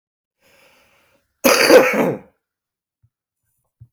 {"cough_length": "3.9 s", "cough_amplitude": 32025, "cough_signal_mean_std_ratio": 0.32, "survey_phase": "beta (2021-08-13 to 2022-03-07)", "age": "65+", "gender": "Male", "wearing_mask": "No", "symptom_cough_any": true, "symptom_new_continuous_cough": true, "symptom_runny_or_blocked_nose": true, "symptom_shortness_of_breath": true, "symptom_fatigue": true, "symptom_headache": true, "symptom_change_to_sense_of_smell_or_taste": true, "symptom_loss_of_taste": true, "symptom_onset": "6 days", "smoker_status": "Never smoked", "respiratory_condition_asthma": false, "respiratory_condition_other": false, "recruitment_source": "Test and Trace", "submission_delay": "2 days", "covid_test_result": "Positive", "covid_test_method": "RT-qPCR", "covid_ct_value": 15.4, "covid_ct_gene": "ORF1ab gene", "covid_ct_mean": 15.6, "covid_viral_load": "7600000 copies/ml", "covid_viral_load_category": "High viral load (>1M copies/ml)"}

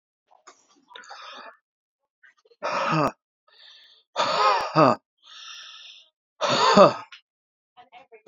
{"exhalation_length": "8.3 s", "exhalation_amplitude": 27721, "exhalation_signal_mean_std_ratio": 0.35, "survey_phase": "beta (2021-08-13 to 2022-03-07)", "age": "18-44", "gender": "Male", "wearing_mask": "No", "symptom_none": true, "smoker_status": "Current smoker (1 to 10 cigarettes per day)", "respiratory_condition_asthma": false, "respiratory_condition_other": false, "recruitment_source": "REACT", "submission_delay": "2 days", "covid_test_result": "Negative", "covid_test_method": "RT-qPCR", "influenza_a_test_result": "Negative", "influenza_b_test_result": "Negative"}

